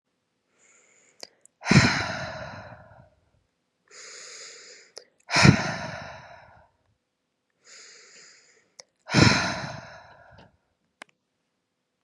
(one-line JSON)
{"exhalation_length": "12.0 s", "exhalation_amplitude": 27422, "exhalation_signal_mean_std_ratio": 0.28, "survey_phase": "beta (2021-08-13 to 2022-03-07)", "age": "18-44", "gender": "Female", "wearing_mask": "No", "symptom_cough_any": true, "symptom_runny_or_blocked_nose": true, "symptom_shortness_of_breath": true, "symptom_sore_throat": true, "symptom_fatigue": true, "symptom_headache": true, "symptom_change_to_sense_of_smell_or_taste": true, "symptom_loss_of_taste": true, "symptom_onset": "4 days", "smoker_status": "Never smoked", "respiratory_condition_asthma": false, "respiratory_condition_other": false, "recruitment_source": "Test and Trace", "submission_delay": "1 day", "covid_test_result": "Positive", "covid_test_method": "ePCR"}